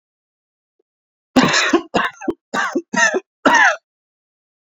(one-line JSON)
{"three_cough_length": "4.7 s", "three_cough_amplitude": 29667, "three_cough_signal_mean_std_ratio": 0.44, "survey_phase": "beta (2021-08-13 to 2022-03-07)", "age": "45-64", "gender": "Male", "wearing_mask": "No", "symptom_cough_any": true, "symptom_runny_or_blocked_nose": true, "symptom_fatigue": true, "symptom_fever_high_temperature": true, "symptom_headache": true, "symptom_onset": "3 days", "smoker_status": "Never smoked", "respiratory_condition_asthma": false, "respiratory_condition_other": false, "recruitment_source": "Test and Trace", "submission_delay": "2 days", "covid_test_result": "Positive", "covid_test_method": "RT-qPCR"}